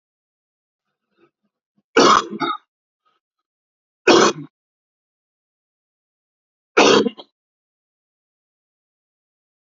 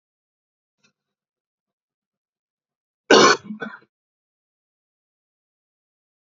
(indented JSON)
{
  "three_cough_length": "9.6 s",
  "three_cough_amplitude": 31051,
  "three_cough_signal_mean_std_ratio": 0.25,
  "cough_length": "6.2 s",
  "cough_amplitude": 29231,
  "cough_signal_mean_std_ratio": 0.17,
  "survey_phase": "beta (2021-08-13 to 2022-03-07)",
  "age": "65+",
  "gender": "Male",
  "wearing_mask": "No",
  "symptom_cough_any": true,
  "symptom_runny_or_blocked_nose": true,
  "symptom_onset": "4 days",
  "smoker_status": "Never smoked",
  "respiratory_condition_asthma": true,
  "respiratory_condition_other": false,
  "recruitment_source": "Test and Trace",
  "submission_delay": "2 days",
  "covid_test_result": "Positive",
  "covid_test_method": "RT-qPCR"
}